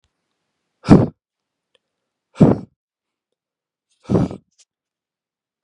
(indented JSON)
{
  "exhalation_length": "5.6 s",
  "exhalation_amplitude": 32768,
  "exhalation_signal_mean_std_ratio": 0.22,
  "survey_phase": "beta (2021-08-13 to 2022-03-07)",
  "age": "18-44",
  "gender": "Male",
  "wearing_mask": "No",
  "symptom_cough_any": true,
  "symptom_runny_or_blocked_nose": true,
  "symptom_shortness_of_breath": true,
  "symptom_sore_throat": true,
  "symptom_fatigue": true,
  "symptom_headache": true,
  "symptom_change_to_sense_of_smell_or_taste": true,
  "symptom_loss_of_taste": true,
  "symptom_onset": "5 days",
  "smoker_status": "Never smoked",
  "respiratory_condition_asthma": false,
  "respiratory_condition_other": false,
  "recruitment_source": "Test and Trace",
  "submission_delay": "1 day",
  "covid_test_result": "Positive",
  "covid_test_method": "RT-qPCR",
  "covid_ct_value": 16.3,
  "covid_ct_gene": "ORF1ab gene",
  "covid_ct_mean": 16.8,
  "covid_viral_load": "3100000 copies/ml",
  "covid_viral_load_category": "High viral load (>1M copies/ml)"
}